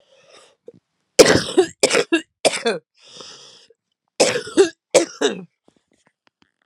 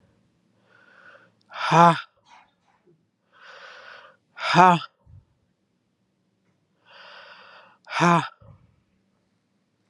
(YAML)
cough_length: 6.7 s
cough_amplitude: 32768
cough_signal_mean_std_ratio: 0.35
exhalation_length: 9.9 s
exhalation_amplitude: 32632
exhalation_signal_mean_std_ratio: 0.24
survey_phase: alpha (2021-03-01 to 2021-08-12)
age: 18-44
gender: Female
wearing_mask: 'No'
symptom_cough_any: true
symptom_new_continuous_cough: true
symptom_abdominal_pain: true
symptom_diarrhoea: true
symptom_fatigue: true
symptom_fever_high_temperature: true
symptom_headache: true
symptom_change_to_sense_of_smell_or_taste: true
symptom_loss_of_taste: true
symptom_onset: 3 days
smoker_status: Never smoked
respiratory_condition_asthma: false
respiratory_condition_other: false
recruitment_source: Test and Trace
submission_delay: 2 days
covid_test_result: Positive
covid_test_method: RT-qPCR
covid_ct_value: 15.0
covid_ct_gene: ORF1ab gene
covid_ct_mean: 15.1
covid_viral_load: 11000000 copies/ml
covid_viral_load_category: High viral load (>1M copies/ml)